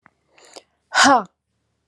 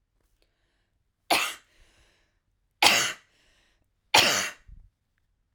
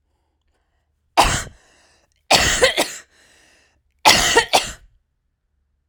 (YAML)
exhalation_length: 1.9 s
exhalation_amplitude: 28899
exhalation_signal_mean_std_ratio: 0.31
three_cough_length: 5.5 s
three_cough_amplitude: 32767
three_cough_signal_mean_std_ratio: 0.29
cough_length: 5.9 s
cough_amplitude: 32768
cough_signal_mean_std_ratio: 0.36
survey_phase: alpha (2021-03-01 to 2021-08-12)
age: 45-64
gender: Female
wearing_mask: 'No'
symptom_none: true
smoker_status: Ex-smoker
respiratory_condition_asthma: false
respiratory_condition_other: false
recruitment_source: REACT
submission_delay: 4 days
covid_test_result: Negative
covid_test_method: RT-qPCR